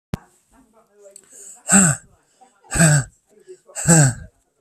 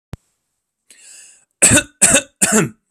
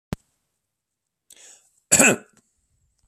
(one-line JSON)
{"exhalation_length": "4.6 s", "exhalation_amplitude": 32601, "exhalation_signal_mean_std_ratio": 0.38, "three_cough_length": "2.9 s", "three_cough_amplitude": 32768, "three_cough_signal_mean_std_ratio": 0.38, "cough_length": "3.1 s", "cough_amplitude": 31915, "cough_signal_mean_std_ratio": 0.22, "survey_phase": "beta (2021-08-13 to 2022-03-07)", "age": "18-44", "gender": "Male", "wearing_mask": "No", "symptom_none": true, "smoker_status": "Never smoked", "respiratory_condition_asthma": false, "respiratory_condition_other": false, "recruitment_source": "REACT", "submission_delay": "2 days", "covid_test_result": "Negative", "covid_test_method": "RT-qPCR"}